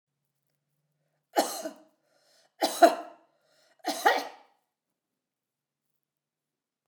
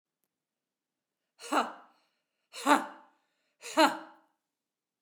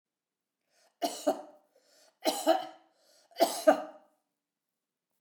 {"three_cough_length": "6.9 s", "three_cough_amplitude": 21649, "three_cough_signal_mean_std_ratio": 0.23, "exhalation_length": "5.0 s", "exhalation_amplitude": 12191, "exhalation_signal_mean_std_ratio": 0.25, "cough_length": "5.2 s", "cough_amplitude": 11844, "cough_signal_mean_std_ratio": 0.3, "survey_phase": "beta (2021-08-13 to 2022-03-07)", "age": "65+", "gender": "Female", "wearing_mask": "No", "symptom_none": true, "smoker_status": "Never smoked", "respiratory_condition_asthma": false, "respiratory_condition_other": false, "recruitment_source": "REACT", "submission_delay": "3 days", "covid_test_result": "Negative", "covid_test_method": "RT-qPCR"}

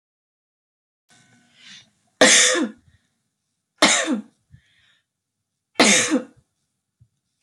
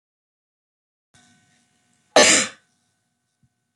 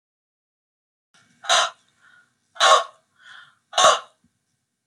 {"three_cough_length": "7.4 s", "three_cough_amplitude": 28762, "three_cough_signal_mean_std_ratio": 0.32, "cough_length": "3.8 s", "cough_amplitude": 28623, "cough_signal_mean_std_ratio": 0.22, "exhalation_length": "4.9 s", "exhalation_amplitude": 25979, "exhalation_signal_mean_std_ratio": 0.29, "survey_phase": "beta (2021-08-13 to 2022-03-07)", "age": "18-44", "gender": "Female", "wearing_mask": "No", "symptom_none": true, "smoker_status": "Never smoked", "respiratory_condition_asthma": false, "respiratory_condition_other": false, "recruitment_source": "REACT", "submission_delay": "1 day", "covid_test_result": "Negative", "covid_test_method": "RT-qPCR"}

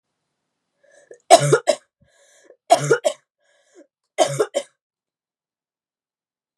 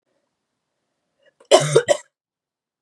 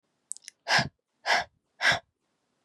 {"three_cough_length": "6.6 s", "three_cough_amplitude": 32768, "three_cough_signal_mean_std_ratio": 0.26, "cough_length": "2.8 s", "cough_amplitude": 32767, "cough_signal_mean_std_ratio": 0.26, "exhalation_length": "2.6 s", "exhalation_amplitude": 11012, "exhalation_signal_mean_std_ratio": 0.35, "survey_phase": "beta (2021-08-13 to 2022-03-07)", "age": "18-44", "gender": "Female", "wearing_mask": "No", "symptom_runny_or_blocked_nose": true, "symptom_sore_throat": true, "symptom_headache": true, "smoker_status": "Never smoked", "respiratory_condition_asthma": false, "respiratory_condition_other": false, "recruitment_source": "Test and Trace", "submission_delay": "1 day", "covid_test_result": "Positive", "covid_test_method": "RT-qPCR", "covid_ct_value": 16.9, "covid_ct_gene": "ORF1ab gene", "covid_ct_mean": 17.2, "covid_viral_load": "2400000 copies/ml", "covid_viral_load_category": "High viral load (>1M copies/ml)"}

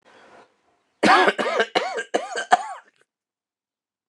{"cough_length": "4.1 s", "cough_amplitude": 29203, "cough_signal_mean_std_ratio": 0.39, "survey_phase": "beta (2021-08-13 to 2022-03-07)", "age": "45-64", "gender": "Male", "wearing_mask": "No", "symptom_cough_any": true, "symptom_sore_throat": true, "symptom_diarrhoea": true, "symptom_fatigue": true, "symptom_fever_high_temperature": true, "symptom_headache": true, "symptom_other": true, "symptom_onset": "2 days", "smoker_status": "Never smoked", "respiratory_condition_asthma": false, "respiratory_condition_other": false, "recruitment_source": "Test and Trace", "submission_delay": "2 days", "covid_test_result": "Positive", "covid_test_method": "RT-qPCR", "covid_ct_value": 26.1, "covid_ct_gene": "ORF1ab gene"}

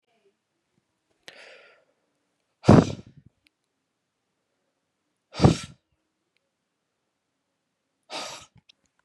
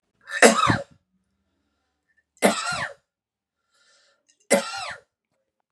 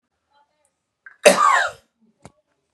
{"exhalation_length": "9.0 s", "exhalation_amplitude": 31228, "exhalation_signal_mean_std_ratio": 0.16, "three_cough_length": "5.7 s", "three_cough_amplitude": 32023, "three_cough_signal_mean_std_ratio": 0.3, "cough_length": "2.7 s", "cough_amplitude": 32767, "cough_signal_mean_std_ratio": 0.3, "survey_phase": "beta (2021-08-13 to 2022-03-07)", "age": "18-44", "gender": "Male", "wearing_mask": "No", "symptom_none": true, "smoker_status": "Ex-smoker", "respiratory_condition_asthma": false, "respiratory_condition_other": false, "recruitment_source": "REACT", "submission_delay": "1 day", "covid_test_result": "Negative", "covid_test_method": "RT-qPCR", "influenza_a_test_result": "Negative", "influenza_b_test_result": "Negative"}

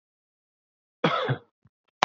{"cough_length": "2.0 s", "cough_amplitude": 27493, "cough_signal_mean_std_ratio": 0.3, "survey_phase": "beta (2021-08-13 to 2022-03-07)", "age": "18-44", "gender": "Male", "wearing_mask": "No", "symptom_none": true, "smoker_status": "Never smoked", "respiratory_condition_asthma": false, "respiratory_condition_other": false, "recruitment_source": "REACT", "submission_delay": "4 days", "covid_test_result": "Negative", "covid_test_method": "RT-qPCR"}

